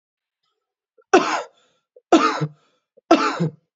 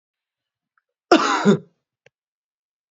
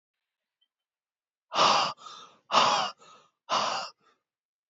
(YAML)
three_cough_length: 3.8 s
three_cough_amplitude: 31796
three_cough_signal_mean_std_ratio: 0.36
cough_length: 2.9 s
cough_amplitude: 32344
cough_signal_mean_std_ratio: 0.29
exhalation_length: 4.7 s
exhalation_amplitude: 12438
exhalation_signal_mean_std_ratio: 0.39
survey_phase: beta (2021-08-13 to 2022-03-07)
age: 18-44
gender: Male
wearing_mask: 'No'
symptom_runny_or_blocked_nose: true
smoker_status: Never smoked
respiratory_condition_asthma: true
respiratory_condition_other: false
recruitment_source: REACT
submission_delay: 0 days
covid_test_result: Negative
covid_test_method: RT-qPCR
influenza_a_test_result: Negative
influenza_b_test_result: Negative